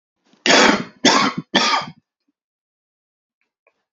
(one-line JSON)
{"three_cough_length": "3.9 s", "three_cough_amplitude": 29712, "three_cough_signal_mean_std_ratio": 0.39, "survey_phase": "beta (2021-08-13 to 2022-03-07)", "age": "18-44", "gender": "Male", "wearing_mask": "No", "symptom_none": true, "smoker_status": "Current smoker (11 or more cigarettes per day)", "respiratory_condition_asthma": false, "respiratory_condition_other": false, "recruitment_source": "REACT", "submission_delay": "1 day", "covid_test_result": "Negative", "covid_test_method": "RT-qPCR", "influenza_a_test_result": "Negative", "influenza_b_test_result": "Negative"}